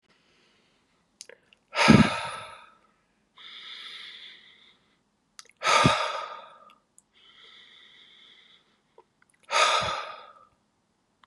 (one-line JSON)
{"exhalation_length": "11.3 s", "exhalation_amplitude": 22424, "exhalation_signal_mean_std_ratio": 0.3, "survey_phase": "beta (2021-08-13 to 2022-03-07)", "age": "18-44", "gender": "Male", "wearing_mask": "No", "symptom_none": true, "symptom_onset": "2 days", "smoker_status": "Never smoked", "respiratory_condition_asthma": false, "respiratory_condition_other": false, "recruitment_source": "REACT", "submission_delay": "0 days", "covid_test_result": "Negative", "covid_test_method": "RT-qPCR"}